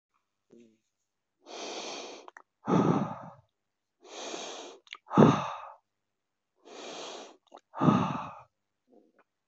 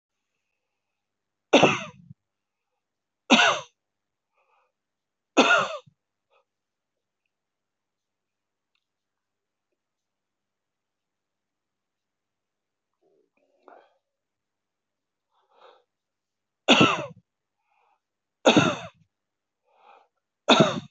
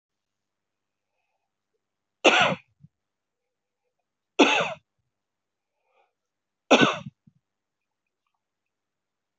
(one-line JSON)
{"exhalation_length": "9.5 s", "exhalation_amplitude": 20705, "exhalation_signal_mean_std_ratio": 0.33, "three_cough_length": "20.9 s", "three_cough_amplitude": 23912, "three_cough_signal_mean_std_ratio": 0.22, "cough_length": "9.4 s", "cough_amplitude": 22561, "cough_signal_mean_std_ratio": 0.22, "survey_phase": "alpha (2021-03-01 to 2021-08-12)", "age": "65+", "gender": "Male", "wearing_mask": "No", "symptom_none": true, "smoker_status": "Ex-smoker", "respiratory_condition_asthma": false, "respiratory_condition_other": false, "recruitment_source": "REACT", "submission_delay": "1 day", "covid_test_result": "Negative", "covid_test_method": "RT-qPCR"}